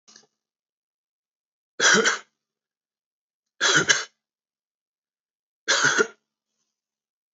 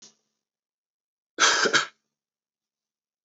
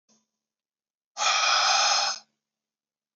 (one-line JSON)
{"three_cough_length": "7.3 s", "three_cough_amplitude": 25723, "three_cough_signal_mean_std_ratio": 0.3, "cough_length": "3.2 s", "cough_amplitude": 16404, "cough_signal_mean_std_ratio": 0.29, "exhalation_length": "3.2 s", "exhalation_amplitude": 10877, "exhalation_signal_mean_std_ratio": 0.48, "survey_phase": "beta (2021-08-13 to 2022-03-07)", "age": "18-44", "gender": "Male", "wearing_mask": "No", "symptom_cough_any": true, "symptom_new_continuous_cough": true, "symptom_runny_or_blocked_nose": true, "symptom_fatigue": true, "symptom_headache": true, "symptom_onset": "3 days", "smoker_status": "Ex-smoker", "respiratory_condition_asthma": false, "respiratory_condition_other": false, "recruitment_source": "Test and Trace", "submission_delay": "2 days", "covid_test_result": "Positive", "covid_test_method": "RT-qPCR", "covid_ct_value": 18.4, "covid_ct_gene": "ORF1ab gene", "covid_ct_mean": 19.6, "covid_viral_load": "370000 copies/ml", "covid_viral_load_category": "Low viral load (10K-1M copies/ml)"}